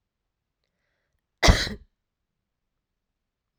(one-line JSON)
{"cough_length": "3.6 s", "cough_amplitude": 25325, "cough_signal_mean_std_ratio": 0.18, "survey_phase": "alpha (2021-03-01 to 2021-08-12)", "age": "45-64", "gender": "Female", "wearing_mask": "No", "symptom_cough_any": true, "symptom_abdominal_pain": true, "symptom_fever_high_temperature": true, "symptom_headache": true, "symptom_change_to_sense_of_smell_or_taste": true, "symptom_loss_of_taste": true, "symptom_onset": "7 days", "smoker_status": "Never smoked", "respiratory_condition_asthma": false, "respiratory_condition_other": false, "recruitment_source": "Test and Trace", "submission_delay": "1 day", "covid_test_result": "Positive", "covid_test_method": "RT-qPCR"}